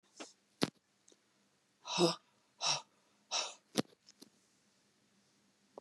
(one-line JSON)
{"exhalation_length": "5.8 s", "exhalation_amplitude": 8075, "exhalation_signal_mean_std_ratio": 0.27, "survey_phase": "beta (2021-08-13 to 2022-03-07)", "age": "65+", "gender": "Female", "wearing_mask": "No", "symptom_cough_any": true, "smoker_status": "Ex-smoker", "respiratory_condition_asthma": false, "respiratory_condition_other": false, "recruitment_source": "REACT", "submission_delay": "2 days", "covid_test_result": "Negative", "covid_test_method": "RT-qPCR", "influenza_a_test_result": "Negative", "influenza_b_test_result": "Negative"}